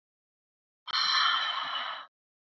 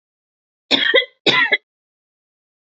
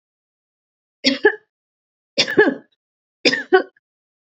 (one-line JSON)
{"exhalation_length": "2.6 s", "exhalation_amplitude": 7190, "exhalation_signal_mean_std_ratio": 0.54, "cough_length": "2.6 s", "cough_amplitude": 29934, "cough_signal_mean_std_ratio": 0.38, "three_cough_length": "4.4 s", "three_cough_amplitude": 30884, "three_cough_signal_mean_std_ratio": 0.31, "survey_phase": "beta (2021-08-13 to 2022-03-07)", "age": "45-64", "gender": "Female", "wearing_mask": "No", "symptom_none": true, "smoker_status": "Never smoked", "respiratory_condition_asthma": false, "respiratory_condition_other": false, "recruitment_source": "REACT", "submission_delay": "2 days", "covid_test_result": "Negative", "covid_test_method": "RT-qPCR", "influenza_a_test_result": "Negative", "influenza_b_test_result": "Negative"}